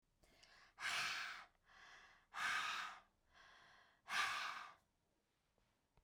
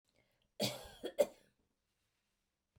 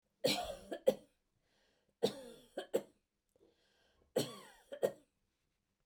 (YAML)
exhalation_length: 6.0 s
exhalation_amplitude: 1312
exhalation_signal_mean_std_ratio: 0.49
cough_length: 2.8 s
cough_amplitude: 4279
cough_signal_mean_std_ratio: 0.24
three_cough_length: 5.9 s
three_cough_amplitude: 4918
three_cough_signal_mean_std_ratio: 0.29
survey_phase: beta (2021-08-13 to 2022-03-07)
age: 45-64
gender: Female
wearing_mask: 'No'
symptom_none: true
smoker_status: Never smoked
respiratory_condition_asthma: false
respiratory_condition_other: false
recruitment_source: REACT
submission_delay: 2 days
covid_test_result: Negative
covid_test_method: RT-qPCR